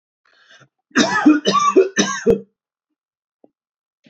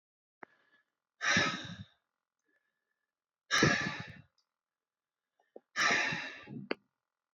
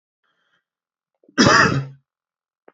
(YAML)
three_cough_length: 4.1 s
three_cough_amplitude: 27985
three_cough_signal_mean_std_ratio: 0.42
exhalation_length: 7.3 s
exhalation_amplitude: 7121
exhalation_signal_mean_std_ratio: 0.36
cough_length: 2.7 s
cough_amplitude: 28711
cough_signal_mean_std_ratio: 0.32
survey_phase: beta (2021-08-13 to 2022-03-07)
age: 18-44
gender: Male
wearing_mask: 'No'
symptom_sore_throat: true
symptom_onset: 3 days
smoker_status: Never smoked
respiratory_condition_asthma: false
respiratory_condition_other: false
recruitment_source: Test and Trace
submission_delay: 1 day
covid_test_result: Positive
covid_test_method: RT-qPCR
covid_ct_value: 24.5
covid_ct_gene: N gene